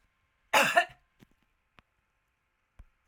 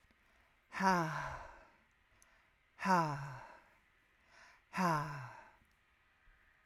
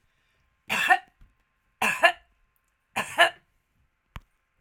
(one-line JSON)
{"cough_length": "3.1 s", "cough_amplitude": 12935, "cough_signal_mean_std_ratio": 0.24, "exhalation_length": "6.7 s", "exhalation_amplitude": 4348, "exhalation_signal_mean_std_ratio": 0.4, "three_cough_length": "4.6 s", "three_cough_amplitude": 28175, "three_cough_signal_mean_std_ratio": 0.29, "survey_phase": "alpha (2021-03-01 to 2021-08-12)", "age": "65+", "gender": "Female", "wearing_mask": "No", "symptom_none": true, "smoker_status": "Never smoked", "respiratory_condition_asthma": false, "respiratory_condition_other": false, "recruitment_source": "REACT", "submission_delay": "1 day", "covid_test_result": "Negative", "covid_test_method": "RT-qPCR"}